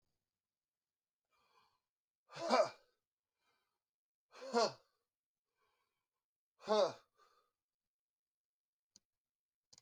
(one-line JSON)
{"exhalation_length": "9.8 s", "exhalation_amplitude": 4327, "exhalation_signal_mean_std_ratio": 0.22, "survey_phase": "beta (2021-08-13 to 2022-03-07)", "age": "45-64", "gender": "Male", "wearing_mask": "No", "symptom_new_continuous_cough": true, "symptom_shortness_of_breath": true, "symptom_sore_throat": true, "symptom_fatigue": true, "symptom_fever_high_temperature": true, "symptom_headache": true, "symptom_onset": "4 days", "smoker_status": "Never smoked", "respiratory_condition_asthma": false, "respiratory_condition_other": false, "recruitment_source": "Test and Trace", "submission_delay": "2 days", "covid_test_result": "Positive", "covid_test_method": "RT-qPCR"}